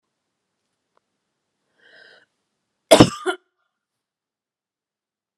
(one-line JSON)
{"cough_length": "5.4 s", "cough_amplitude": 32768, "cough_signal_mean_std_ratio": 0.15, "survey_phase": "beta (2021-08-13 to 2022-03-07)", "age": "45-64", "gender": "Female", "wearing_mask": "No", "symptom_none": true, "smoker_status": "Never smoked", "respiratory_condition_asthma": false, "respiratory_condition_other": false, "recruitment_source": "REACT", "submission_delay": "1 day", "covid_test_result": "Negative", "covid_test_method": "RT-qPCR"}